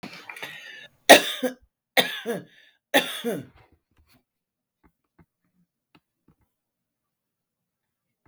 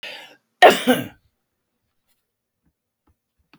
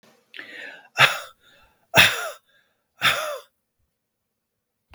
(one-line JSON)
{"three_cough_length": "8.3 s", "three_cough_amplitude": 32768, "three_cough_signal_mean_std_ratio": 0.2, "cough_length": "3.6 s", "cough_amplitude": 32768, "cough_signal_mean_std_ratio": 0.22, "exhalation_length": "4.9 s", "exhalation_amplitude": 32768, "exhalation_signal_mean_std_ratio": 0.3, "survey_phase": "beta (2021-08-13 to 2022-03-07)", "age": "45-64", "gender": "Female", "wearing_mask": "No", "symptom_none": true, "smoker_status": "Ex-smoker", "respiratory_condition_asthma": false, "respiratory_condition_other": false, "recruitment_source": "REACT", "submission_delay": "7 days", "covid_test_result": "Negative", "covid_test_method": "RT-qPCR", "influenza_a_test_result": "Negative", "influenza_b_test_result": "Negative"}